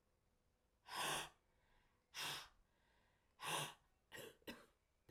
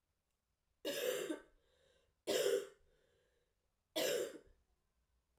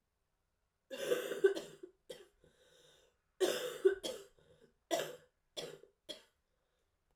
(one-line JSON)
{"exhalation_length": "5.1 s", "exhalation_amplitude": 900, "exhalation_signal_mean_std_ratio": 0.42, "three_cough_length": "5.4 s", "three_cough_amplitude": 2245, "three_cough_signal_mean_std_ratio": 0.41, "cough_length": "7.2 s", "cough_amplitude": 4081, "cough_signal_mean_std_ratio": 0.33, "survey_phase": "beta (2021-08-13 to 2022-03-07)", "age": "18-44", "gender": "Female", "wearing_mask": "No", "symptom_cough_any": true, "symptom_runny_or_blocked_nose": true, "symptom_shortness_of_breath": true, "symptom_fatigue": true, "symptom_headache": true, "symptom_change_to_sense_of_smell_or_taste": true, "symptom_loss_of_taste": true, "symptom_onset": "3 days", "smoker_status": "Never smoked", "respiratory_condition_asthma": false, "respiratory_condition_other": false, "recruitment_source": "Test and Trace", "submission_delay": "2 days", "covid_test_result": "Positive", "covid_test_method": "RT-qPCR", "covid_ct_value": 17.0, "covid_ct_gene": "ORF1ab gene", "covid_ct_mean": 17.4, "covid_viral_load": "2000000 copies/ml", "covid_viral_load_category": "High viral load (>1M copies/ml)"}